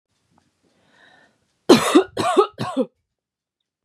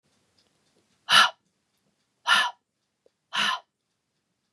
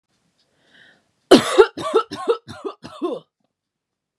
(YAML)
three_cough_length: 3.8 s
three_cough_amplitude: 32605
three_cough_signal_mean_std_ratio: 0.32
exhalation_length: 4.5 s
exhalation_amplitude: 23482
exhalation_signal_mean_std_ratio: 0.28
cough_length: 4.2 s
cough_amplitude: 32768
cough_signal_mean_std_ratio: 0.3
survey_phase: beta (2021-08-13 to 2022-03-07)
age: 18-44
gender: Female
wearing_mask: 'No'
symptom_none: true
smoker_status: Never smoked
respiratory_condition_asthma: false
respiratory_condition_other: false
recruitment_source: REACT
submission_delay: 1 day
covid_test_result: Negative
covid_test_method: RT-qPCR
influenza_a_test_result: Negative
influenza_b_test_result: Negative